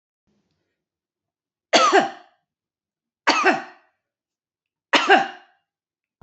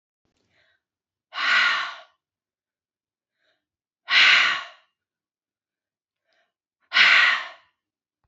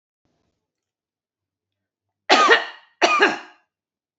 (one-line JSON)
{"three_cough_length": "6.2 s", "three_cough_amplitude": 27802, "three_cough_signal_mean_std_ratio": 0.31, "exhalation_length": "8.3 s", "exhalation_amplitude": 21923, "exhalation_signal_mean_std_ratio": 0.34, "cough_length": "4.2 s", "cough_amplitude": 28536, "cough_signal_mean_std_ratio": 0.32, "survey_phase": "beta (2021-08-13 to 2022-03-07)", "age": "45-64", "gender": "Female", "wearing_mask": "No", "symptom_none": true, "smoker_status": "Never smoked", "respiratory_condition_asthma": false, "respiratory_condition_other": false, "recruitment_source": "REACT", "submission_delay": "1 day", "covid_test_result": "Negative", "covid_test_method": "RT-qPCR", "influenza_a_test_result": "Unknown/Void", "influenza_b_test_result": "Unknown/Void"}